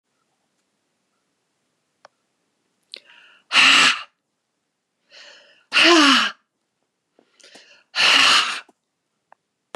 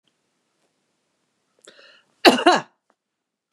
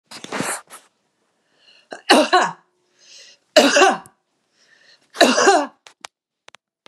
{"exhalation_length": "9.8 s", "exhalation_amplitude": 30100, "exhalation_signal_mean_std_ratio": 0.33, "cough_length": "3.5 s", "cough_amplitude": 32768, "cough_signal_mean_std_ratio": 0.21, "three_cough_length": "6.9 s", "three_cough_amplitude": 32768, "three_cough_signal_mean_std_ratio": 0.36, "survey_phase": "beta (2021-08-13 to 2022-03-07)", "age": "65+", "gender": "Female", "wearing_mask": "No", "symptom_none": true, "smoker_status": "Ex-smoker", "respiratory_condition_asthma": false, "respiratory_condition_other": false, "recruitment_source": "REACT", "submission_delay": "2 days", "covid_test_result": "Negative", "covid_test_method": "RT-qPCR", "influenza_a_test_result": "Negative", "influenza_b_test_result": "Negative"}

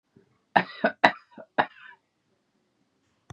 {"three_cough_length": "3.3 s", "three_cough_amplitude": 32583, "three_cough_signal_mean_std_ratio": 0.22, "survey_phase": "beta (2021-08-13 to 2022-03-07)", "age": "65+", "gender": "Female", "wearing_mask": "No", "symptom_cough_any": true, "symptom_shortness_of_breath": true, "symptom_sore_throat": true, "symptom_change_to_sense_of_smell_or_taste": true, "symptom_onset": "9 days", "smoker_status": "Never smoked", "respiratory_condition_asthma": false, "respiratory_condition_other": false, "recruitment_source": "Test and Trace", "submission_delay": "1 day", "covid_test_result": "Negative", "covid_test_method": "RT-qPCR"}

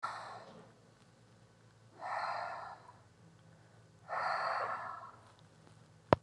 {"exhalation_length": "6.2 s", "exhalation_amplitude": 17747, "exhalation_signal_mean_std_ratio": 0.42, "survey_phase": "beta (2021-08-13 to 2022-03-07)", "age": "18-44", "gender": "Female", "wearing_mask": "No", "symptom_cough_any": true, "symptom_runny_or_blocked_nose": true, "symptom_shortness_of_breath": true, "symptom_sore_throat": true, "symptom_fatigue": true, "smoker_status": "Never smoked", "respiratory_condition_asthma": false, "respiratory_condition_other": false, "recruitment_source": "Test and Trace", "submission_delay": "2 days", "covid_test_result": "Positive", "covid_test_method": "LFT"}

